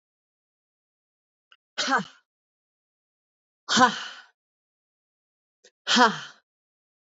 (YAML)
exhalation_length: 7.2 s
exhalation_amplitude: 25409
exhalation_signal_mean_std_ratio: 0.25
survey_phase: beta (2021-08-13 to 2022-03-07)
age: 18-44
gender: Female
wearing_mask: 'No'
symptom_cough_any: true
symptom_sore_throat: true
symptom_fever_high_temperature: true
smoker_status: Current smoker (1 to 10 cigarettes per day)
respiratory_condition_asthma: false
respiratory_condition_other: false
recruitment_source: Test and Trace
submission_delay: 1 day
covid_test_result: Positive
covid_test_method: LFT